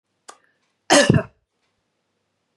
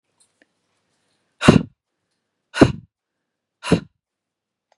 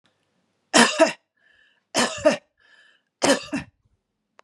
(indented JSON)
{
  "cough_length": "2.6 s",
  "cough_amplitude": 30552,
  "cough_signal_mean_std_ratio": 0.26,
  "exhalation_length": "4.8 s",
  "exhalation_amplitude": 32768,
  "exhalation_signal_mean_std_ratio": 0.2,
  "three_cough_length": "4.4 s",
  "three_cough_amplitude": 30492,
  "three_cough_signal_mean_std_ratio": 0.33,
  "survey_phase": "beta (2021-08-13 to 2022-03-07)",
  "age": "45-64",
  "gender": "Female",
  "wearing_mask": "No",
  "symptom_none": true,
  "smoker_status": "Never smoked",
  "respiratory_condition_asthma": false,
  "respiratory_condition_other": false,
  "recruitment_source": "REACT",
  "submission_delay": "1 day",
  "covid_test_result": "Negative",
  "covid_test_method": "RT-qPCR",
  "influenza_a_test_result": "Negative",
  "influenza_b_test_result": "Negative"
}